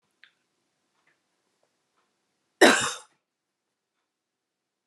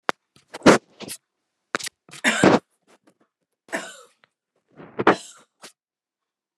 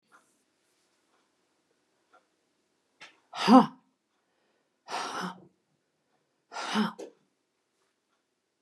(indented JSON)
{
  "cough_length": "4.9 s",
  "cough_amplitude": 26052,
  "cough_signal_mean_std_ratio": 0.17,
  "three_cough_length": "6.6 s",
  "three_cough_amplitude": 29204,
  "three_cough_signal_mean_std_ratio": 0.25,
  "exhalation_length": "8.6 s",
  "exhalation_amplitude": 17708,
  "exhalation_signal_mean_std_ratio": 0.2,
  "survey_phase": "alpha (2021-03-01 to 2021-08-12)",
  "age": "65+",
  "gender": "Female",
  "wearing_mask": "No",
  "symptom_none": true,
  "symptom_onset": "2 days",
  "smoker_status": "Never smoked",
  "respiratory_condition_asthma": false,
  "respiratory_condition_other": false,
  "recruitment_source": "REACT",
  "submission_delay": "2 days",
  "covid_test_result": "Negative",
  "covid_test_method": "RT-qPCR"
}